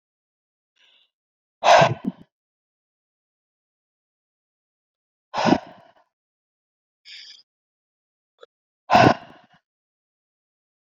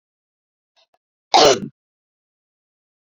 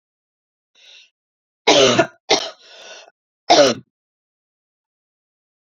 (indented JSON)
{
  "exhalation_length": "10.9 s",
  "exhalation_amplitude": 27333,
  "exhalation_signal_mean_std_ratio": 0.21,
  "cough_length": "3.1 s",
  "cough_amplitude": 32767,
  "cough_signal_mean_std_ratio": 0.23,
  "three_cough_length": "5.6 s",
  "three_cough_amplitude": 32702,
  "three_cough_signal_mean_std_ratio": 0.3,
  "survey_phase": "beta (2021-08-13 to 2022-03-07)",
  "age": "18-44",
  "gender": "Female",
  "wearing_mask": "No",
  "symptom_new_continuous_cough": true,
  "symptom_abdominal_pain": true,
  "symptom_fatigue": true,
  "symptom_fever_high_temperature": true,
  "symptom_headache": true,
  "symptom_change_to_sense_of_smell_or_taste": true,
  "symptom_other": true,
  "symptom_onset": "3 days",
  "smoker_status": "Never smoked",
  "respiratory_condition_asthma": false,
  "respiratory_condition_other": false,
  "recruitment_source": "Test and Trace",
  "submission_delay": "2 days",
  "covid_test_result": "Positive",
  "covid_test_method": "RT-qPCR"
}